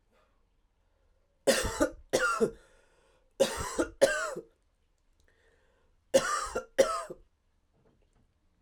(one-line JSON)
{"three_cough_length": "8.6 s", "three_cough_amplitude": 13027, "three_cough_signal_mean_std_ratio": 0.37, "survey_phase": "beta (2021-08-13 to 2022-03-07)", "age": "18-44", "gender": "Male", "wearing_mask": "No", "symptom_fatigue": true, "symptom_headache": true, "symptom_change_to_sense_of_smell_or_taste": true, "symptom_loss_of_taste": true, "symptom_onset": "6 days", "smoker_status": "Never smoked", "respiratory_condition_asthma": false, "respiratory_condition_other": false, "recruitment_source": "Test and Trace", "submission_delay": "3 days", "covid_test_result": "Positive", "covid_test_method": "RT-qPCR", "covid_ct_value": 17.0, "covid_ct_gene": "ORF1ab gene", "covid_ct_mean": 17.5, "covid_viral_load": "1800000 copies/ml", "covid_viral_load_category": "High viral load (>1M copies/ml)"}